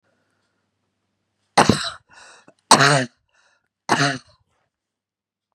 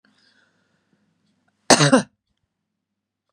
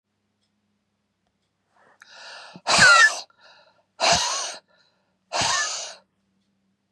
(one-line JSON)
{"three_cough_length": "5.5 s", "three_cough_amplitude": 32768, "three_cough_signal_mean_std_ratio": 0.28, "cough_length": "3.3 s", "cough_amplitude": 32767, "cough_signal_mean_std_ratio": 0.22, "exhalation_length": "6.9 s", "exhalation_amplitude": 27233, "exhalation_signal_mean_std_ratio": 0.34, "survey_phase": "beta (2021-08-13 to 2022-03-07)", "age": "45-64", "gender": "Female", "wearing_mask": "No", "symptom_none": true, "smoker_status": "Never smoked", "respiratory_condition_asthma": false, "respiratory_condition_other": false, "recruitment_source": "REACT", "submission_delay": "0 days", "covid_test_result": "Negative", "covid_test_method": "RT-qPCR", "influenza_a_test_result": "Negative", "influenza_b_test_result": "Negative"}